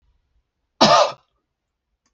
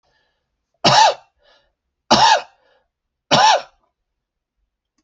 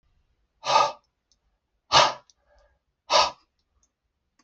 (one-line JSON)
{"cough_length": "2.1 s", "cough_amplitude": 28129, "cough_signal_mean_std_ratio": 0.3, "three_cough_length": "5.0 s", "three_cough_amplitude": 30431, "three_cough_signal_mean_std_ratio": 0.35, "exhalation_length": "4.4 s", "exhalation_amplitude": 23965, "exhalation_signal_mean_std_ratio": 0.29, "survey_phase": "alpha (2021-03-01 to 2021-08-12)", "age": "45-64", "gender": "Male", "wearing_mask": "No", "symptom_none": true, "smoker_status": "Ex-smoker", "respiratory_condition_asthma": false, "respiratory_condition_other": false, "recruitment_source": "REACT", "submission_delay": "3 days", "covid_test_result": "Negative", "covid_test_method": "RT-qPCR"}